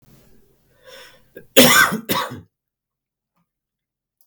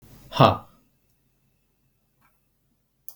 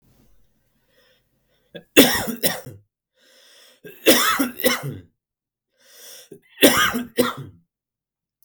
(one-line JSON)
{"cough_length": "4.3 s", "cough_amplitude": 32768, "cough_signal_mean_std_ratio": 0.29, "exhalation_length": "3.2 s", "exhalation_amplitude": 32768, "exhalation_signal_mean_std_ratio": 0.19, "three_cough_length": "8.4 s", "three_cough_amplitude": 32768, "three_cough_signal_mean_std_ratio": 0.34, "survey_phase": "beta (2021-08-13 to 2022-03-07)", "age": "18-44", "gender": "Male", "wearing_mask": "No", "symptom_none": true, "symptom_onset": "12 days", "smoker_status": "Ex-smoker", "respiratory_condition_asthma": false, "respiratory_condition_other": false, "recruitment_source": "REACT", "submission_delay": "1 day", "covid_test_result": "Negative", "covid_test_method": "RT-qPCR", "influenza_a_test_result": "Negative", "influenza_b_test_result": "Negative"}